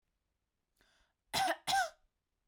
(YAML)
cough_length: 2.5 s
cough_amplitude: 2934
cough_signal_mean_std_ratio: 0.35
survey_phase: beta (2021-08-13 to 2022-03-07)
age: 18-44
gender: Female
wearing_mask: 'No'
symptom_none: true
smoker_status: Never smoked
respiratory_condition_asthma: false
respiratory_condition_other: false
recruitment_source: REACT
submission_delay: 6 days
covid_test_result: Negative
covid_test_method: RT-qPCR
influenza_a_test_result: Negative
influenza_b_test_result: Negative